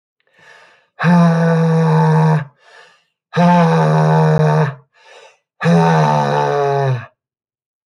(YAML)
exhalation_length: 7.9 s
exhalation_amplitude: 27645
exhalation_signal_mean_std_ratio: 0.73
survey_phase: beta (2021-08-13 to 2022-03-07)
age: 45-64
gender: Male
wearing_mask: 'No'
symptom_cough_any: true
symptom_runny_or_blocked_nose: true
symptom_sore_throat: true
symptom_headache: true
symptom_onset: 3 days
smoker_status: Never smoked
respiratory_condition_asthma: false
respiratory_condition_other: false
recruitment_source: Test and Trace
submission_delay: 2 days
covid_test_result: Positive
covid_test_method: RT-qPCR
covid_ct_value: 35.4
covid_ct_gene: N gene